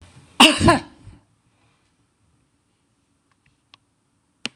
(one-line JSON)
{"cough_length": "4.6 s", "cough_amplitude": 26028, "cough_signal_mean_std_ratio": 0.22, "survey_phase": "beta (2021-08-13 to 2022-03-07)", "age": "65+", "gender": "Female", "wearing_mask": "No", "symptom_none": true, "smoker_status": "Ex-smoker", "respiratory_condition_asthma": false, "respiratory_condition_other": false, "recruitment_source": "REACT", "submission_delay": "0 days", "covid_test_result": "Negative", "covid_test_method": "RT-qPCR", "influenza_a_test_result": "Unknown/Void", "influenza_b_test_result": "Unknown/Void"}